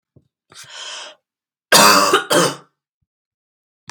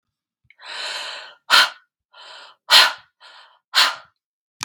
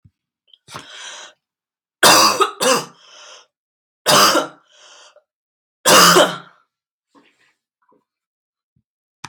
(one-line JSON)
{"cough_length": "3.9 s", "cough_amplitude": 32768, "cough_signal_mean_std_ratio": 0.37, "exhalation_length": "4.6 s", "exhalation_amplitude": 32768, "exhalation_signal_mean_std_ratio": 0.32, "three_cough_length": "9.3 s", "three_cough_amplitude": 32768, "three_cough_signal_mean_std_ratio": 0.34, "survey_phase": "beta (2021-08-13 to 2022-03-07)", "age": "18-44", "gender": "Female", "wearing_mask": "No", "symptom_none": true, "smoker_status": "Never smoked", "respiratory_condition_asthma": false, "respiratory_condition_other": false, "recruitment_source": "REACT", "submission_delay": "0 days", "covid_test_result": "Negative", "covid_test_method": "RT-qPCR", "influenza_a_test_result": "Negative", "influenza_b_test_result": "Negative"}